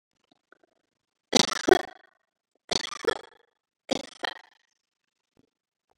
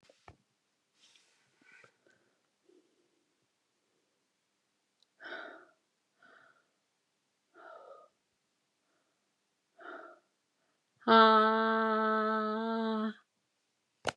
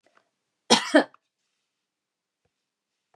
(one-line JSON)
{"three_cough_length": "6.0 s", "three_cough_amplitude": 26441, "three_cough_signal_mean_std_ratio": 0.2, "exhalation_length": "14.2 s", "exhalation_amplitude": 10888, "exhalation_signal_mean_std_ratio": 0.29, "cough_length": "3.2 s", "cough_amplitude": 25183, "cough_signal_mean_std_ratio": 0.2, "survey_phase": "beta (2021-08-13 to 2022-03-07)", "age": "65+", "gender": "Female", "wearing_mask": "No", "symptom_none": true, "smoker_status": "Never smoked", "respiratory_condition_asthma": false, "respiratory_condition_other": false, "recruitment_source": "REACT", "submission_delay": "2 days", "covid_test_result": "Negative", "covid_test_method": "RT-qPCR", "influenza_a_test_result": "Negative", "influenza_b_test_result": "Negative"}